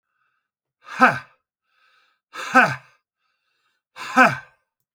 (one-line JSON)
{"exhalation_length": "4.9 s", "exhalation_amplitude": 27976, "exhalation_signal_mean_std_ratio": 0.28, "survey_phase": "beta (2021-08-13 to 2022-03-07)", "age": "65+", "gender": "Male", "wearing_mask": "No", "symptom_none": true, "smoker_status": "Ex-smoker", "respiratory_condition_asthma": false, "respiratory_condition_other": false, "recruitment_source": "REACT", "submission_delay": "2 days", "covid_test_result": "Negative", "covid_test_method": "RT-qPCR"}